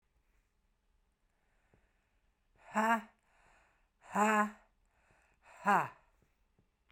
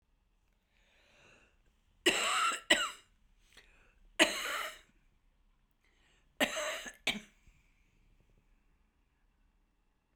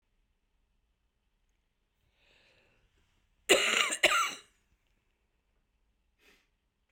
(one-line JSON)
{"exhalation_length": "6.9 s", "exhalation_amplitude": 5183, "exhalation_signal_mean_std_ratio": 0.29, "three_cough_length": "10.2 s", "three_cough_amplitude": 9234, "three_cough_signal_mean_std_ratio": 0.31, "cough_length": "6.9 s", "cough_amplitude": 11312, "cough_signal_mean_std_ratio": 0.25, "survey_phase": "beta (2021-08-13 to 2022-03-07)", "age": "65+", "gender": "Female", "wearing_mask": "No", "symptom_cough_any": true, "symptom_runny_or_blocked_nose": true, "symptom_shortness_of_breath": true, "symptom_fatigue": true, "symptom_headache": true, "symptom_change_to_sense_of_smell_or_taste": true, "smoker_status": "Ex-smoker", "respiratory_condition_asthma": false, "respiratory_condition_other": false, "recruitment_source": "Test and Trace", "submission_delay": "3 days", "covid_test_result": "Positive", "covid_test_method": "RT-qPCR", "covid_ct_value": 22.1, "covid_ct_gene": "ORF1ab gene", "covid_ct_mean": 22.6, "covid_viral_load": "39000 copies/ml", "covid_viral_load_category": "Low viral load (10K-1M copies/ml)"}